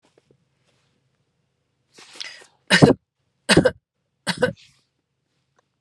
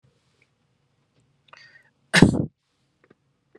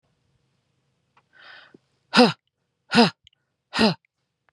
{"three_cough_length": "5.8 s", "three_cough_amplitude": 32768, "three_cough_signal_mean_std_ratio": 0.23, "cough_length": "3.6 s", "cough_amplitude": 32768, "cough_signal_mean_std_ratio": 0.19, "exhalation_length": "4.5 s", "exhalation_amplitude": 30803, "exhalation_signal_mean_std_ratio": 0.26, "survey_phase": "beta (2021-08-13 to 2022-03-07)", "age": "45-64", "gender": "Female", "wearing_mask": "No", "symptom_runny_or_blocked_nose": true, "smoker_status": "Never smoked", "respiratory_condition_asthma": true, "respiratory_condition_other": false, "recruitment_source": "REACT", "submission_delay": "6 days", "covid_test_result": "Negative", "covid_test_method": "RT-qPCR", "influenza_a_test_result": "Negative", "influenza_b_test_result": "Negative"}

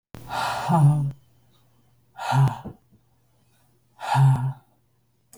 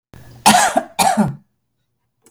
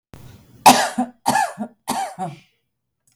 {"exhalation_length": "5.4 s", "exhalation_amplitude": 13249, "exhalation_signal_mean_std_ratio": 0.46, "cough_length": "2.3 s", "cough_amplitude": 32768, "cough_signal_mean_std_ratio": 0.45, "three_cough_length": "3.2 s", "three_cough_amplitude": 32768, "three_cough_signal_mean_std_ratio": 0.37, "survey_phase": "beta (2021-08-13 to 2022-03-07)", "age": "45-64", "gender": "Female", "wearing_mask": "No", "symptom_none": true, "smoker_status": "Ex-smoker", "respiratory_condition_asthma": false, "respiratory_condition_other": false, "recruitment_source": "REACT", "submission_delay": "3 days", "covid_test_result": "Negative", "covid_test_method": "RT-qPCR", "influenza_a_test_result": "Unknown/Void", "influenza_b_test_result": "Unknown/Void"}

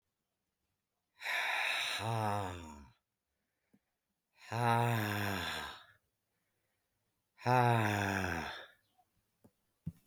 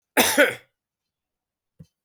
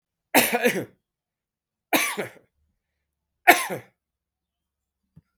{"exhalation_length": "10.1 s", "exhalation_amplitude": 4832, "exhalation_signal_mean_std_ratio": 0.48, "cough_length": "2.0 s", "cough_amplitude": 30285, "cough_signal_mean_std_ratio": 0.3, "three_cough_length": "5.4 s", "three_cough_amplitude": 32644, "three_cough_signal_mean_std_ratio": 0.28, "survey_phase": "beta (2021-08-13 to 2022-03-07)", "age": "65+", "gender": "Male", "wearing_mask": "Yes", "symptom_cough_any": true, "symptom_change_to_sense_of_smell_or_taste": true, "symptom_loss_of_taste": true, "symptom_onset": "10 days", "smoker_status": "Never smoked", "respiratory_condition_asthma": false, "respiratory_condition_other": false, "recruitment_source": "Test and Trace", "submission_delay": "2 days", "covid_test_result": "Positive", "covid_test_method": "RT-qPCR", "covid_ct_value": 15.0, "covid_ct_gene": "ORF1ab gene", "covid_ct_mean": 15.5, "covid_viral_load": "8400000 copies/ml", "covid_viral_load_category": "High viral load (>1M copies/ml)"}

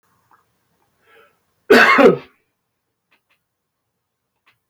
{"cough_length": "4.7 s", "cough_amplitude": 30094, "cough_signal_mean_std_ratio": 0.26, "survey_phase": "beta (2021-08-13 to 2022-03-07)", "age": "65+", "gender": "Male", "wearing_mask": "No", "symptom_none": true, "smoker_status": "Ex-smoker", "respiratory_condition_asthma": false, "respiratory_condition_other": false, "recruitment_source": "REACT", "submission_delay": "3 days", "covid_test_result": "Negative", "covid_test_method": "RT-qPCR", "influenza_a_test_result": "Negative", "influenza_b_test_result": "Negative"}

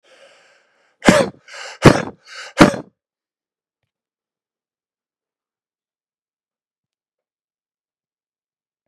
{"exhalation_length": "8.9 s", "exhalation_amplitude": 32768, "exhalation_signal_mean_std_ratio": 0.19, "survey_phase": "beta (2021-08-13 to 2022-03-07)", "age": "45-64", "gender": "Male", "wearing_mask": "No", "symptom_none": true, "smoker_status": "Never smoked", "respiratory_condition_asthma": false, "respiratory_condition_other": false, "recruitment_source": "REACT", "submission_delay": "1 day", "covid_test_result": "Negative", "covid_test_method": "RT-qPCR", "influenza_a_test_result": "Negative", "influenza_b_test_result": "Negative"}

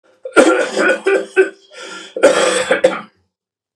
{"cough_length": "3.8 s", "cough_amplitude": 32768, "cough_signal_mean_std_ratio": 0.56, "survey_phase": "beta (2021-08-13 to 2022-03-07)", "age": "45-64", "gender": "Male", "wearing_mask": "No", "symptom_cough_any": true, "smoker_status": "Never smoked", "respiratory_condition_asthma": false, "respiratory_condition_other": false, "recruitment_source": "Test and Trace", "submission_delay": "2 days", "covid_test_result": "Positive", "covid_test_method": "RT-qPCR", "covid_ct_value": 19.2, "covid_ct_gene": "ORF1ab gene"}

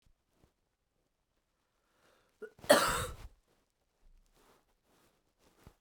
{"cough_length": "5.8 s", "cough_amplitude": 12733, "cough_signal_mean_std_ratio": 0.2, "survey_phase": "beta (2021-08-13 to 2022-03-07)", "age": "45-64", "gender": "Female", "wearing_mask": "No", "symptom_new_continuous_cough": true, "symptom_sore_throat": true, "symptom_onset": "3 days", "smoker_status": "Never smoked", "respiratory_condition_asthma": false, "respiratory_condition_other": false, "recruitment_source": "Test and Trace", "submission_delay": "1 day", "covid_test_result": "Positive", "covid_test_method": "RT-qPCR", "covid_ct_value": 34.2, "covid_ct_gene": "ORF1ab gene"}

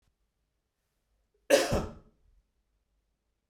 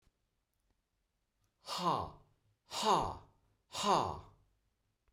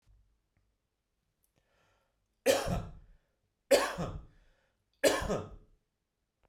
{"cough_length": "3.5 s", "cough_amplitude": 11918, "cough_signal_mean_std_ratio": 0.24, "exhalation_length": "5.1 s", "exhalation_amplitude": 4660, "exhalation_signal_mean_std_ratio": 0.37, "three_cough_length": "6.5 s", "three_cough_amplitude": 9172, "three_cough_signal_mean_std_ratio": 0.31, "survey_phase": "beta (2021-08-13 to 2022-03-07)", "age": "45-64", "gender": "Male", "wearing_mask": "No", "symptom_cough_any": true, "symptom_runny_or_blocked_nose": true, "symptom_shortness_of_breath": true, "symptom_sore_throat": true, "symptom_abdominal_pain": true, "symptom_fatigue": true, "symptom_headache": true, "symptom_onset": "3 days", "smoker_status": "Never smoked", "respiratory_condition_asthma": false, "respiratory_condition_other": false, "recruitment_source": "Test and Trace", "submission_delay": "2 days", "covid_test_result": "Positive", "covid_test_method": "RT-qPCR", "covid_ct_value": 32.7, "covid_ct_gene": "ORF1ab gene"}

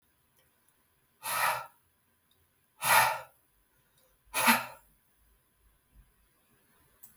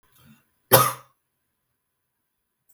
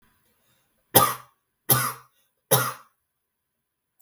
{"exhalation_length": "7.2 s", "exhalation_amplitude": 10795, "exhalation_signal_mean_std_ratio": 0.29, "cough_length": "2.7 s", "cough_amplitude": 32766, "cough_signal_mean_std_ratio": 0.2, "three_cough_length": "4.0 s", "three_cough_amplitude": 32768, "three_cough_signal_mean_std_ratio": 0.28, "survey_phase": "beta (2021-08-13 to 2022-03-07)", "age": "18-44", "gender": "Female", "wearing_mask": "No", "symptom_none": true, "smoker_status": "Never smoked", "respiratory_condition_asthma": false, "respiratory_condition_other": false, "recruitment_source": "REACT", "submission_delay": "2 days", "covid_test_result": "Negative", "covid_test_method": "RT-qPCR", "influenza_a_test_result": "Negative", "influenza_b_test_result": "Negative"}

